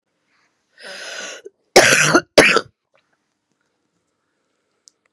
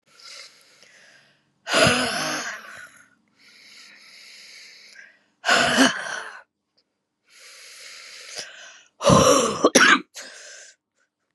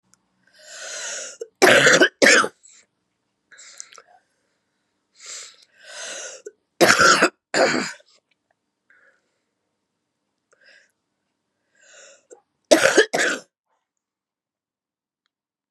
{"cough_length": "5.1 s", "cough_amplitude": 32768, "cough_signal_mean_std_ratio": 0.3, "exhalation_length": "11.3 s", "exhalation_amplitude": 32068, "exhalation_signal_mean_std_ratio": 0.38, "three_cough_length": "15.7 s", "three_cough_amplitude": 32768, "three_cough_signal_mean_std_ratio": 0.3, "survey_phase": "beta (2021-08-13 to 2022-03-07)", "age": "45-64", "gender": "Female", "wearing_mask": "No", "symptom_new_continuous_cough": true, "symptom_runny_or_blocked_nose": true, "symptom_sore_throat": true, "symptom_onset": "5 days", "smoker_status": "Never smoked", "respiratory_condition_asthma": false, "respiratory_condition_other": false, "recruitment_source": "Test and Trace", "submission_delay": "2 days", "covid_test_result": "Positive", "covid_test_method": "RT-qPCR", "covid_ct_value": 24.3, "covid_ct_gene": "N gene"}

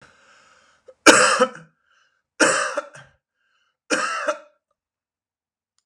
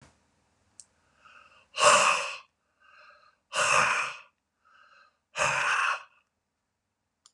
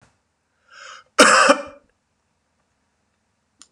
{"three_cough_length": "5.9 s", "three_cough_amplitude": 32768, "three_cough_signal_mean_std_ratio": 0.32, "exhalation_length": "7.3 s", "exhalation_amplitude": 14306, "exhalation_signal_mean_std_ratio": 0.39, "cough_length": "3.7 s", "cough_amplitude": 32768, "cough_signal_mean_std_ratio": 0.27, "survey_phase": "beta (2021-08-13 to 2022-03-07)", "age": "65+", "gender": "Male", "wearing_mask": "No", "symptom_cough_any": true, "symptom_fatigue": true, "symptom_other": true, "symptom_onset": "9 days", "smoker_status": "Never smoked", "respiratory_condition_asthma": false, "respiratory_condition_other": false, "recruitment_source": "Test and Trace", "submission_delay": "1 day", "covid_test_result": "Negative", "covid_test_method": "RT-qPCR"}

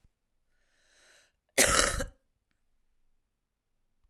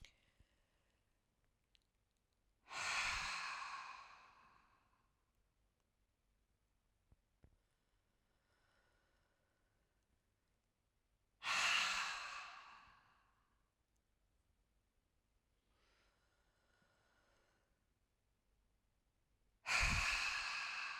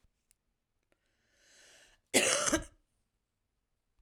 {"cough_length": "4.1 s", "cough_amplitude": 19383, "cough_signal_mean_std_ratio": 0.25, "exhalation_length": "21.0 s", "exhalation_amplitude": 1890, "exhalation_signal_mean_std_ratio": 0.34, "three_cough_length": "4.0 s", "three_cough_amplitude": 9493, "three_cough_signal_mean_std_ratio": 0.27, "survey_phase": "alpha (2021-03-01 to 2021-08-12)", "age": "45-64", "gender": "Female", "wearing_mask": "No", "symptom_none": true, "smoker_status": "Current smoker (e-cigarettes or vapes only)", "respiratory_condition_asthma": true, "respiratory_condition_other": false, "recruitment_source": "REACT", "submission_delay": "3 days", "covid_test_result": "Negative", "covid_test_method": "RT-qPCR"}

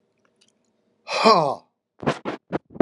{"exhalation_length": "2.8 s", "exhalation_amplitude": 29084, "exhalation_signal_mean_std_ratio": 0.34, "survey_phase": "beta (2021-08-13 to 2022-03-07)", "age": "65+", "gender": "Male", "wearing_mask": "No", "symptom_none": true, "smoker_status": "Never smoked", "respiratory_condition_asthma": false, "respiratory_condition_other": false, "recruitment_source": "REACT", "submission_delay": "1 day", "covid_test_result": "Negative", "covid_test_method": "RT-qPCR"}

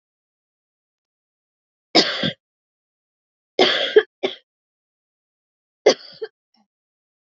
{"three_cough_length": "7.3 s", "three_cough_amplitude": 32101, "three_cough_signal_mean_std_ratio": 0.24, "survey_phase": "alpha (2021-03-01 to 2021-08-12)", "age": "18-44", "gender": "Female", "wearing_mask": "No", "symptom_cough_any": true, "symptom_fatigue": true, "symptom_fever_high_temperature": true, "smoker_status": "Never smoked", "respiratory_condition_asthma": false, "respiratory_condition_other": false, "recruitment_source": "Test and Trace", "submission_delay": "2 days", "covid_test_result": "Positive", "covid_test_method": "RT-qPCR"}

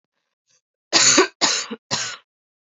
{"three_cough_length": "2.6 s", "three_cough_amplitude": 28709, "three_cough_signal_mean_std_ratio": 0.41, "survey_phase": "alpha (2021-03-01 to 2021-08-12)", "age": "18-44", "gender": "Female", "wearing_mask": "No", "symptom_cough_any": true, "symptom_new_continuous_cough": true, "symptom_diarrhoea": true, "symptom_headache": true, "symptom_change_to_sense_of_smell_or_taste": true, "symptom_onset": "4 days", "smoker_status": "Never smoked", "respiratory_condition_asthma": false, "respiratory_condition_other": false, "recruitment_source": "Test and Trace", "submission_delay": "1 day", "covid_test_result": "Positive", "covid_test_method": "RT-qPCR", "covid_ct_value": 16.8, "covid_ct_gene": "ORF1ab gene", "covid_ct_mean": 17.3, "covid_viral_load": "2200000 copies/ml", "covid_viral_load_category": "High viral load (>1M copies/ml)"}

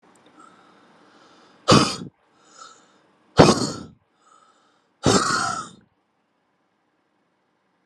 {"exhalation_length": "7.9 s", "exhalation_amplitude": 32768, "exhalation_signal_mean_std_ratio": 0.28, "survey_phase": "alpha (2021-03-01 to 2021-08-12)", "age": "18-44", "gender": "Male", "wearing_mask": "No", "symptom_cough_any": true, "symptom_new_continuous_cough": true, "symptom_fatigue": true, "symptom_fever_high_temperature": true, "symptom_change_to_sense_of_smell_or_taste": true, "symptom_loss_of_taste": true, "symptom_onset": "5 days", "smoker_status": "Never smoked", "respiratory_condition_asthma": true, "respiratory_condition_other": false, "recruitment_source": "Test and Trace", "submission_delay": "1 day", "covid_test_result": "Positive", "covid_test_method": "RT-qPCR"}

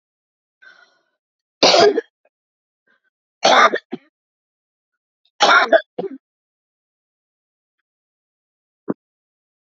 {"three_cough_length": "9.7 s", "three_cough_amplitude": 31222, "three_cough_signal_mean_std_ratio": 0.27, "survey_phase": "beta (2021-08-13 to 2022-03-07)", "age": "65+", "gender": "Female", "wearing_mask": "No", "symptom_shortness_of_breath": true, "smoker_status": "Never smoked", "respiratory_condition_asthma": false, "respiratory_condition_other": false, "recruitment_source": "REACT", "submission_delay": "2 days", "covid_test_result": "Negative", "covid_test_method": "RT-qPCR", "influenza_a_test_result": "Negative", "influenza_b_test_result": "Negative"}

